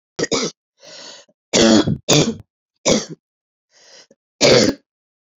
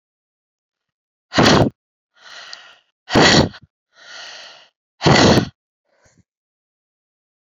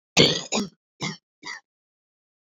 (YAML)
three_cough_length: 5.4 s
three_cough_amplitude: 31284
three_cough_signal_mean_std_ratio: 0.41
exhalation_length: 7.5 s
exhalation_amplitude: 32768
exhalation_signal_mean_std_ratio: 0.33
cough_length: 2.5 s
cough_amplitude: 27811
cough_signal_mean_std_ratio: 0.33
survey_phase: beta (2021-08-13 to 2022-03-07)
age: 45-64
gender: Female
wearing_mask: 'No'
symptom_cough_any: true
symptom_runny_or_blocked_nose: true
symptom_fatigue: true
symptom_fever_high_temperature: true
symptom_headache: true
symptom_change_to_sense_of_smell_or_taste: true
symptom_onset: 3 days
smoker_status: Ex-smoker
respiratory_condition_asthma: false
respiratory_condition_other: false
recruitment_source: Test and Trace
submission_delay: 2 days
covid_test_result: Positive
covid_test_method: LAMP